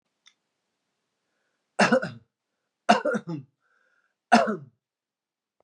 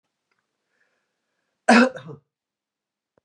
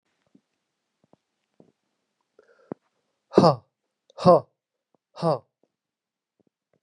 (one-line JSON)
{"three_cough_length": "5.6 s", "three_cough_amplitude": 23804, "three_cough_signal_mean_std_ratio": 0.28, "cough_length": "3.2 s", "cough_amplitude": 29806, "cough_signal_mean_std_ratio": 0.22, "exhalation_length": "6.8 s", "exhalation_amplitude": 27141, "exhalation_signal_mean_std_ratio": 0.2, "survey_phase": "beta (2021-08-13 to 2022-03-07)", "age": "45-64", "gender": "Male", "wearing_mask": "No", "symptom_none": true, "smoker_status": "Never smoked", "respiratory_condition_asthma": false, "respiratory_condition_other": false, "recruitment_source": "Test and Trace", "submission_delay": "2 days", "covid_test_result": "Negative", "covid_test_method": "RT-qPCR"}